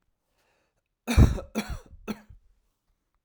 {
  "three_cough_length": "3.2 s",
  "three_cough_amplitude": 17583,
  "three_cough_signal_mean_std_ratio": 0.26,
  "survey_phase": "alpha (2021-03-01 to 2021-08-12)",
  "age": "45-64",
  "gender": "Male",
  "wearing_mask": "No",
  "symptom_cough_any": true,
  "symptom_fever_high_temperature": true,
  "symptom_headache": true,
  "symptom_onset": "3 days",
  "smoker_status": "Never smoked",
  "respiratory_condition_asthma": false,
  "respiratory_condition_other": false,
  "recruitment_source": "Test and Trace",
  "submission_delay": "1 day",
  "covid_test_result": "Positive",
  "covid_test_method": "RT-qPCR",
  "covid_ct_value": 18.1,
  "covid_ct_gene": "ORF1ab gene"
}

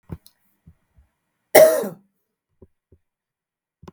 {
  "cough_length": "3.9 s",
  "cough_amplitude": 32768,
  "cough_signal_mean_std_ratio": 0.21,
  "survey_phase": "beta (2021-08-13 to 2022-03-07)",
  "age": "45-64",
  "gender": "Female",
  "wearing_mask": "No",
  "symptom_sore_throat": true,
  "smoker_status": "Never smoked",
  "respiratory_condition_asthma": false,
  "respiratory_condition_other": false,
  "recruitment_source": "Test and Trace",
  "submission_delay": "0 days",
  "covid_test_result": "Negative",
  "covid_test_method": "LFT"
}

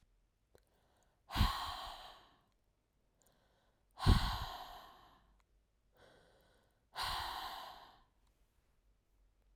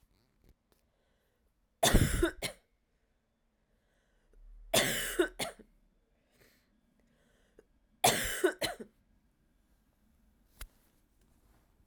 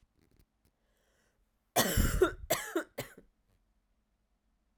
{
  "exhalation_length": "9.6 s",
  "exhalation_amplitude": 5294,
  "exhalation_signal_mean_std_ratio": 0.3,
  "three_cough_length": "11.9 s",
  "three_cough_amplitude": 9832,
  "three_cough_signal_mean_std_ratio": 0.29,
  "cough_length": "4.8 s",
  "cough_amplitude": 7675,
  "cough_signal_mean_std_ratio": 0.32,
  "survey_phase": "alpha (2021-03-01 to 2021-08-12)",
  "age": "18-44",
  "gender": "Female",
  "wearing_mask": "No",
  "symptom_cough_any": true,
  "symptom_headache": true,
  "symptom_onset": "2 days",
  "smoker_status": "Never smoked",
  "respiratory_condition_asthma": false,
  "respiratory_condition_other": false,
  "recruitment_source": "Test and Trace",
  "submission_delay": "1 day",
  "covid_test_result": "Positive",
  "covid_test_method": "RT-qPCR",
  "covid_ct_value": 21.2,
  "covid_ct_gene": "ORF1ab gene",
  "covid_ct_mean": 21.7,
  "covid_viral_load": "74000 copies/ml",
  "covid_viral_load_category": "Low viral load (10K-1M copies/ml)"
}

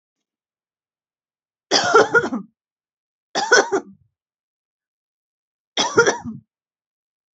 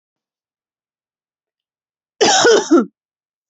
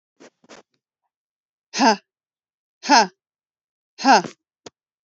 {
  "three_cough_length": "7.3 s",
  "three_cough_amplitude": 29087,
  "three_cough_signal_mean_std_ratio": 0.31,
  "cough_length": "3.5 s",
  "cough_amplitude": 29247,
  "cough_signal_mean_std_ratio": 0.34,
  "exhalation_length": "5.0 s",
  "exhalation_amplitude": 31076,
  "exhalation_signal_mean_std_ratio": 0.26,
  "survey_phase": "beta (2021-08-13 to 2022-03-07)",
  "age": "18-44",
  "gender": "Female",
  "wearing_mask": "No",
  "symptom_none": true,
  "smoker_status": "Never smoked",
  "respiratory_condition_asthma": false,
  "respiratory_condition_other": false,
  "recruitment_source": "REACT",
  "submission_delay": "1 day",
  "covid_test_result": "Negative",
  "covid_test_method": "RT-qPCR",
  "influenza_a_test_result": "Unknown/Void",
  "influenza_b_test_result": "Unknown/Void"
}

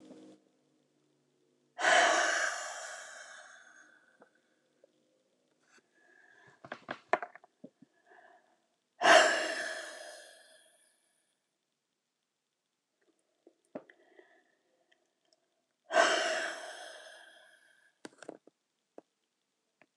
{
  "exhalation_length": "20.0 s",
  "exhalation_amplitude": 12655,
  "exhalation_signal_mean_std_ratio": 0.27,
  "survey_phase": "alpha (2021-03-01 to 2021-08-12)",
  "age": "65+",
  "gender": "Female",
  "wearing_mask": "No",
  "symptom_none": true,
  "smoker_status": "Never smoked",
  "respiratory_condition_asthma": false,
  "respiratory_condition_other": false,
  "recruitment_source": "REACT",
  "submission_delay": "1 day",
  "covid_test_result": "Negative",
  "covid_test_method": "RT-qPCR"
}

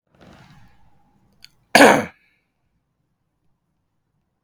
{
  "cough_length": "4.4 s",
  "cough_amplitude": 32768,
  "cough_signal_mean_std_ratio": 0.2,
  "survey_phase": "beta (2021-08-13 to 2022-03-07)",
  "age": "18-44",
  "gender": "Male",
  "wearing_mask": "No",
  "symptom_none": true,
  "smoker_status": "Never smoked",
  "respiratory_condition_asthma": false,
  "respiratory_condition_other": false,
  "recruitment_source": "REACT",
  "submission_delay": "1 day",
  "covid_test_result": "Negative",
  "covid_test_method": "RT-qPCR",
  "influenza_a_test_result": "Negative",
  "influenza_b_test_result": "Negative"
}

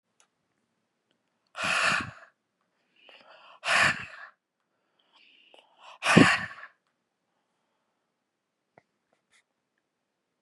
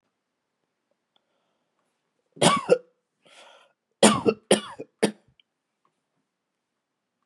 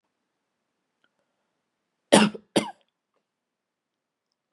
{
  "exhalation_length": "10.4 s",
  "exhalation_amplitude": 25527,
  "exhalation_signal_mean_std_ratio": 0.25,
  "three_cough_length": "7.3 s",
  "three_cough_amplitude": 27658,
  "three_cough_signal_mean_std_ratio": 0.23,
  "cough_length": "4.5 s",
  "cough_amplitude": 32342,
  "cough_signal_mean_std_ratio": 0.18,
  "survey_phase": "beta (2021-08-13 to 2022-03-07)",
  "age": "18-44",
  "gender": "Male",
  "wearing_mask": "No",
  "symptom_cough_any": true,
  "symptom_onset": "3 days",
  "smoker_status": "Ex-smoker",
  "respiratory_condition_asthma": false,
  "respiratory_condition_other": false,
  "recruitment_source": "Test and Trace",
  "submission_delay": "1 day",
  "covid_test_result": "Positive",
  "covid_test_method": "ePCR"
}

